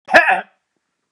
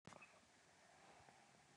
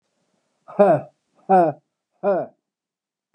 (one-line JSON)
{"cough_length": "1.1 s", "cough_amplitude": 32768, "cough_signal_mean_std_ratio": 0.38, "three_cough_length": "1.8 s", "three_cough_amplitude": 244, "three_cough_signal_mean_std_ratio": 0.87, "exhalation_length": "3.3 s", "exhalation_amplitude": 25702, "exhalation_signal_mean_std_ratio": 0.37, "survey_phase": "beta (2021-08-13 to 2022-03-07)", "age": "65+", "gender": "Male", "wearing_mask": "No", "symptom_none": true, "smoker_status": "Never smoked", "respiratory_condition_asthma": false, "respiratory_condition_other": false, "recruitment_source": "REACT", "submission_delay": "1 day", "covid_test_result": "Negative", "covid_test_method": "RT-qPCR", "influenza_a_test_result": "Negative", "influenza_b_test_result": "Negative"}